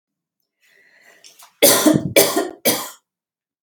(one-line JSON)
{"three_cough_length": "3.6 s", "three_cough_amplitude": 32768, "three_cough_signal_mean_std_ratio": 0.38, "survey_phase": "beta (2021-08-13 to 2022-03-07)", "age": "45-64", "gender": "Female", "wearing_mask": "No", "symptom_none": true, "smoker_status": "Never smoked", "respiratory_condition_asthma": false, "respiratory_condition_other": false, "recruitment_source": "REACT", "submission_delay": "1 day", "covid_test_result": "Negative", "covid_test_method": "RT-qPCR", "influenza_a_test_result": "Negative", "influenza_b_test_result": "Negative"}